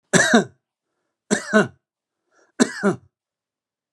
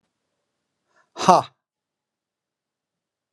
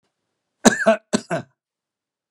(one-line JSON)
{"three_cough_length": "3.9 s", "three_cough_amplitude": 32767, "three_cough_signal_mean_std_ratio": 0.33, "exhalation_length": "3.3 s", "exhalation_amplitude": 32465, "exhalation_signal_mean_std_ratio": 0.17, "cough_length": "2.3 s", "cough_amplitude": 32767, "cough_signal_mean_std_ratio": 0.28, "survey_phase": "alpha (2021-03-01 to 2021-08-12)", "age": "65+", "gender": "Male", "wearing_mask": "No", "symptom_none": true, "smoker_status": "Ex-smoker", "respiratory_condition_asthma": false, "respiratory_condition_other": false, "recruitment_source": "REACT", "submission_delay": "1 day", "covid_test_result": "Negative", "covid_test_method": "RT-qPCR"}